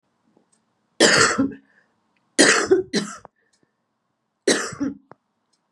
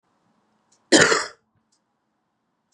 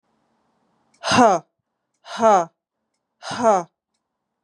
{"three_cough_length": "5.7 s", "three_cough_amplitude": 31423, "three_cough_signal_mean_std_ratio": 0.38, "cough_length": "2.7 s", "cough_amplitude": 32393, "cough_signal_mean_std_ratio": 0.25, "exhalation_length": "4.4 s", "exhalation_amplitude": 29426, "exhalation_signal_mean_std_ratio": 0.34, "survey_phase": "beta (2021-08-13 to 2022-03-07)", "age": "18-44", "gender": "Female", "wearing_mask": "No", "symptom_cough_any": true, "symptom_new_continuous_cough": true, "symptom_runny_or_blocked_nose": true, "symptom_fatigue": true, "symptom_headache": true, "symptom_change_to_sense_of_smell_or_taste": true, "symptom_loss_of_taste": true, "symptom_onset": "4 days", "smoker_status": "Current smoker (e-cigarettes or vapes only)", "respiratory_condition_asthma": false, "respiratory_condition_other": false, "recruitment_source": "Test and Trace", "submission_delay": "2 days", "covid_test_result": "Positive", "covid_test_method": "RT-qPCR"}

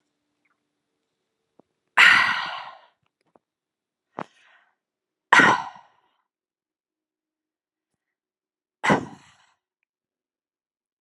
{"exhalation_length": "11.0 s", "exhalation_amplitude": 32082, "exhalation_signal_mean_std_ratio": 0.22, "survey_phase": "alpha (2021-03-01 to 2021-08-12)", "age": "45-64", "gender": "Female", "wearing_mask": "No", "symptom_cough_any": true, "smoker_status": "Never smoked", "respiratory_condition_asthma": false, "respiratory_condition_other": false, "recruitment_source": "REACT", "submission_delay": "1 day", "covid_test_result": "Negative", "covid_test_method": "RT-qPCR"}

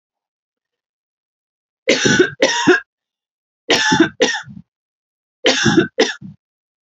{"three_cough_length": "6.8 s", "three_cough_amplitude": 29846, "three_cough_signal_mean_std_ratio": 0.42, "survey_phase": "alpha (2021-03-01 to 2021-08-12)", "age": "18-44", "gender": "Female", "wearing_mask": "No", "symptom_none": true, "smoker_status": "Never smoked", "respiratory_condition_asthma": false, "respiratory_condition_other": false, "recruitment_source": "REACT", "submission_delay": "2 days", "covid_test_result": "Negative", "covid_test_method": "RT-qPCR"}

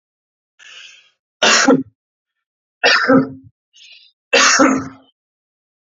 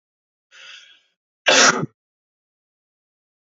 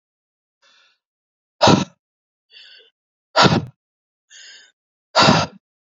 {"three_cough_length": "6.0 s", "three_cough_amplitude": 31565, "three_cough_signal_mean_std_ratio": 0.4, "cough_length": "3.4 s", "cough_amplitude": 28605, "cough_signal_mean_std_ratio": 0.26, "exhalation_length": "6.0 s", "exhalation_amplitude": 32768, "exhalation_signal_mean_std_ratio": 0.29, "survey_phase": "beta (2021-08-13 to 2022-03-07)", "age": "45-64", "gender": "Male", "wearing_mask": "No", "symptom_none": true, "smoker_status": "Ex-smoker", "respiratory_condition_asthma": false, "respiratory_condition_other": false, "recruitment_source": "REACT", "submission_delay": "1 day", "covid_test_result": "Negative", "covid_test_method": "RT-qPCR", "influenza_a_test_result": "Negative", "influenza_b_test_result": "Negative"}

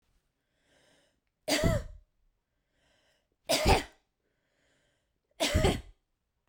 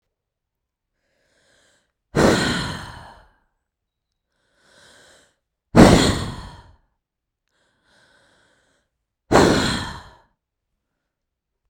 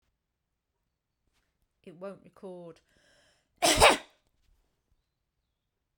{"three_cough_length": "6.5 s", "three_cough_amplitude": 10156, "three_cough_signal_mean_std_ratio": 0.32, "exhalation_length": "11.7 s", "exhalation_amplitude": 32768, "exhalation_signal_mean_std_ratio": 0.27, "cough_length": "6.0 s", "cough_amplitude": 16746, "cough_signal_mean_std_ratio": 0.2, "survey_phase": "beta (2021-08-13 to 2022-03-07)", "age": "18-44", "gender": "Female", "wearing_mask": "No", "symptom_none": true, "smoker_status": "Never smoked", "respiratory_condition_asthma": true, "respiratory_condition_other": false, "recruitment_source": "REACT", "submission_delay": "1 day", "covid_test_result": "Negative", "covid_test_method": "RT-qPCR"}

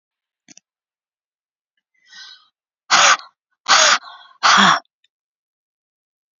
{"exhalation_length": "6.4 s", "exhalation_amplitude": 32768, "exhalation_signal_mean_std_ratio": 0.31, "survey_phase": "beta (2021-08-13 to 2022-03-07)", "age": "45-64", "gender": "Female", "wearing_mask": "No", "symptom_none": true, "smoker_status": "Never smoked", "respiratory_condition_asthma": false, "respiratory_condition_other": false, "recruitment_source": "REACT", "submission_delay": "2 days", "covid_test_result": "Negative", "covid_test_method": "RT-qPCR"}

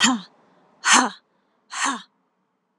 {"exhalation_length": "2.8 s", "exhalation_amplitude": 29069, "exhalation_signal_mean_std_ratio": 0.37, "survey_phase": "alpha (2021-03-01 to 2021-08-12)", "age": "45-64", "gender": "Female", "wearing_mask": "No", "symptom_fatigue": true, "symptom_headache": true, "smoker_status": "Never smoked", "respiratory_condition_asthma": false, "respiratory_condition_other": false, "recruitment_source": "Test and Trace", "submission_delay": "0 days", "covid_test_result": "Positive", "covid_test_method": "LFT"}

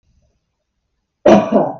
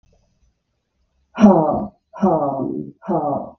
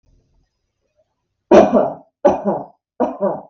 {"cough_length": "1.8 s", "cough_amplitude": 32768, "cough_signal_mean_std_ratio": 0.37, "exhalation_length": "3.6 s", "exhalation_amplitude": 32768, "exhalation_signal_mean_std_ratio": 0.47, "three_cough_length": "3.5 s", "three_cough_amplitude": 32768, "three_cough_signal_mean_std_ratio": 0.38, "survey_phase": "beta (2021-08-13 to 2022-03-07)", "age": "45-64", "gender": "Female", "wearing_mask": "No", "symptom_change_to_sense_of_smell_or_taste": true, "smoker_status": "Never smoked", "respiratory_condition_asthma": false, "respiratory_condition_other": false, "recruitment_source": "REACT", "submission_delay": "1 day", "covid_test_result": "Negative", "covid_test_method": "RT-qPCR"}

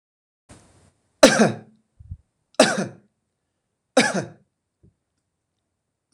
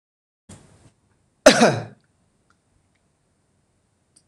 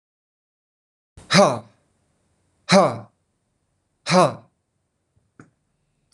{"three_cough_length": "6.1 s", "three_cough_amplitude": 26028, "three_cough_signal_mean_std_ratio": 0.25, "cough_length": "4.3 s", "cough_amplitude": 26028, "cough_signal_mean_std_ratio": 0.2, "exhalation_length": "6.1 s", "exhalation_amplitude": 25971, "exhalation_signal_mean_std_ratio": 0.27, "survey_phase": "beta (2021-08-13 to 2022-03-07)", "age": "18-44", "gender": "Male", "wearing_mask": "No", "symptom_runny_or_blocked_nose": true, "symptom_headache": true, "smoker_status": "Never smoked", "respiratory_condition_asthma": false, "respiratory_condition_other": false, "recruitment_source": "REACT", "submission_delay": "1 day", "covid_test_result": "Negative", "covid_test_method": "RT-qPCR", "influenza_a_test_result": "Negative", "influenza_b_test_result": "Negative"}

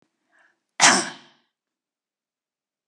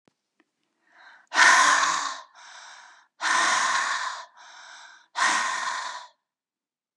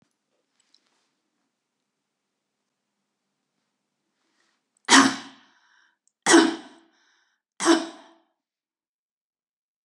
{"cough_length": "2.9 s", "cough_amplitude": 29591, "cough_signal_mean_std_ratio": 0.22, "exhalation_length": "7.0 s", "exhalation_amplitude": 21287, "exhalation_signal_mean_std_ratio": 0.49, "three_cough_length": "9.8 s", "three_cough_amplitude": 26824, "three_cough_signal_mean_std_ratio": 0.21, "survey_phase": "beta (2021-08-13 to 2022-03-07)", "age": "65+", "gender": "Female", "wearing_mask": "No", "symptom_none": true, "smoker_status": "Never smoked", "respiratory_condition_asthma": false, "respiratory_condition_other": false, "recruitment_source": "REACT", "submission_delay": "2 days", "covid_test_result": "Negative", "covid_test_method": "RT-qPCR", "influenza_a_test_result": "Negative", "influenza_b_test_result": "Negative"}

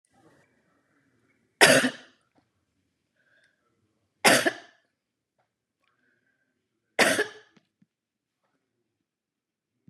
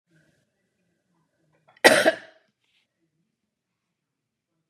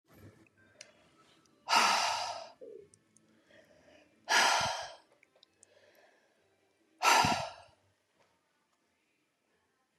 {"three_cough_length": "9.9 s", "three_cough_amplitude": 28630, "three_cough_signal_mean_std_ratio": 0.21, "cough_length": "4.7 s", "cough_amplitude": 32692, "cough_signal_mean_std_ratio": 0.18, "exhalation_length": "10.0 s", "exhalation_amplitude": 7423, "exhalation_signal_mean_std_ratio": 0.33, "survey_phase": "beta (2021-08-13 to 2022-03-07)", "age": "65+", "gender": "Female", "wearing_mask": "No", "symptom_none": true, "smoker_status": "Ex-smoker", "respiratory_condition_asthma": false, "respiratory_condition_other": false, "recruitment_source": "REACT", "submission_delay": "7 days", "covid_test_result": "Negative", "covid_test_method": "RT-qPCR", "influenza_a_test_result": "Negative", "influenza_b_test_result": "Negative"}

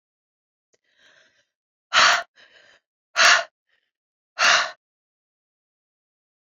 {"exhalation_length": "6.5 s", "exhalation_amplitude": 26530, "exhalation_signal_mean_std_ratio": 0.28, "survey_phase": "beta (2021-08-13 to 2022-03-07)", "age": "45-64", "gender": "Female", "wearing_mask": "No", "symptom_cough_any": true, "symptom_new_continuous_cough": true, "symptom_runny_or_blocked_nose": true, "symptom_shortness_of_breath": true, "symptom_sore_throat": true, "symptom_abdominal_pain": true, "symptom_fatigue": true, "symptom_headache": true, "symptom_change_to_sense_of_smell_or_taste": true, "symptom_loss_of_taste": true, "symptom_onset": "5 days", "smoker_status": "Never smoked", "respiratory_condition_asthma": false, "respiratory_condition_other": false, "recruitment_source": "Test and Trace", "submission_delay": "2 days", "covid_test_result": "Positive", "covid_test_method": "RT-qPCR", "covid_ct_value": 14.7, "covid_ct_gene": "ORF1ab gene", "covid_ct_mean": 15.0, "covid_viral_load": "12000000 copies/ml", "covid_viral_load_category": "High viral load (>1M copies/ml)"}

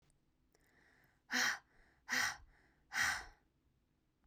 {"exhalation_length": "4.3 s", "exhalation_amplitude": 2596, "exhalation_signal_mean_std_ratio": 0.37, "survey_phase": "beta (2021-08-13 to 2022-03-07)", "age": "18-44", "gender": "Female", "wearing_mask": "No", "symptom_cough_any": true, "symptom_runny_or_blocked_nose": true, "symptom_sore_throat": true, "symptom_fatigue": true, "symptom_headache": true, "smoker_status": "Never smoked", "respiratory_condition_asthma": false, "respiratory_condition_other": false, "recruitment_source": "Test and Trace", "submission_delay": "1 day", "covid_test_result": "Positive", "covid_test_method": "RT-qPCR", "covid_ct_value": 29.6, "covid_ct_gene": "N gene", "covid_ct_mean": 30.1, "covid_viral_load": "130 copies/ml", "covid_viral_load_category": "Minimal viral load (< 10K copies/ml)"}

